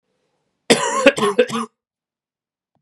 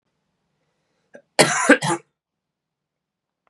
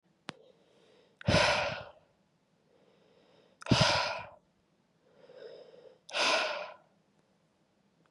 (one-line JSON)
{"three_cough_length": "2.8 s", "three_cough_amplitude": 32768, "three_cough_signal_mean_std_ratio": 0.37, "cough_length": "3.5 s", "cough_amplitude": 31523, "cough_signal_mean_std_ratio": 0.26, "exhalation_length": "8.1 s", "exhalation_amplitude": 10131, "exhalation_signal_mean_std_ratio": 0.36, "survey_phase": "beta (2021-08-13 to 2022-03-07)", "age": "18-44", "gender": "Male", "wearing_mask": "No", "symptom_cough_any": true, "symptom_new_continuous_cough": true, "symptom_runny_or_blocked_nose": true, "symptom_sore_throat": true, "symptom_fatigue": true, "symptom_headache": true, "symptom_onset": "3 days", "smoker_status": "Never smoked", "respiratory_condition_asthma": false, "respiratory_condition_other": false, "recruitment_source": "Test and Trace", "submission_delay": "1 day", "covid_test_result": "Positive", "covid_test_method": "RT-qPCR", "covid_ct_value": 14.6, "covid_ct_gene": "ORF1ab gene"}